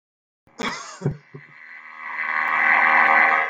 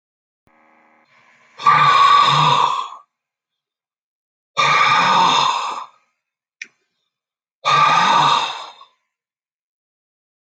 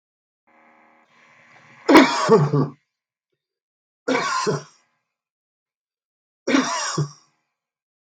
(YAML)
cough_length: 3.5 s
cough_amplitude: 21794
cough_signal_mean_std_ratio: 0.59
exhalation_length: 10.6 s
exhalation_amplitude: 29057
exhalation_signal_mean_std_ratio: 0.49
three_cough_length: 8.2 s
three_cough_amplitude: 32768
three_cough_signal_mean_std_ratio: 0.34
survey_phase: beta (2021-08-13 to 2022-03-07)
age: 65+
gender: Male
wearing_mask: 'No'
symptom_none: true
smoker_status: Never smoked
respiratory_condition_asthma: false
respiratory_condition_other: false
recruitment_source: REACT
submission_delay: 1 day
covid_test_result: Negative
covid_test_method: RT-qPCR
influenza_a_test_result: Negative
influenza_b_test_result: Negative